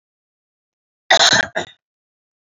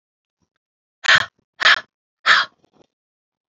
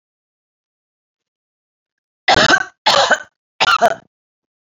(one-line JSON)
{"cough_length": "2.5 s", "cough_amplitude": 32767, "cough_signal_mean_std_ratio": 0.3, "exhalation_length": "3.5 s", "exhalation_amplitude": 29799, "exhalation_signal_mean_std_ratio": 0.29, "three_cough_length": "4.8 s", "three_cough_amplitude": 30507, "three_cough_signal_mean_std_ratio": 0.35, "survey_phase": "beta (2021-08-13 to 2022-03-07)", "age": "45-64", "gender": "Female", "wearing_mask": "No", "symptom_cough_any": true, "symptom_runny_or_blocked_nose": true, "symptom_sore_throat": true, "symptom_onset": "8 days", "smoker_status": "Never smoked", "respiratory_condition_asthma": false, "respiratory_condition_other": false, "recruitment_source": "REACT", "submission_delay": "2 days", "covid_test_result": "Negative", "covid_test_method": "RT-qPCR"}